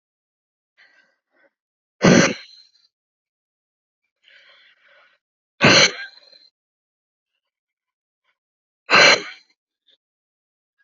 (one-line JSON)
{"exhalation_length": "10.8 s", "exhalation_amplitude": 30078, "exhalation_signal_mean_std_ratio": 0.23, "survey_phase": "alpha (2021-03-01 to 2021-08-12)", "age": "45-64", "gender": "Female", "wearing_mask": "No", "symptom_none": true, "smoker_status": "Never smoked", "respiratory_condition_asthma": false, "respiratory_condition_other": false, "recruitment_source": "REACT", "submission_delay": "1 day", "covid_test_result": "Negative", "covid_test_method": "RT-qPCR"}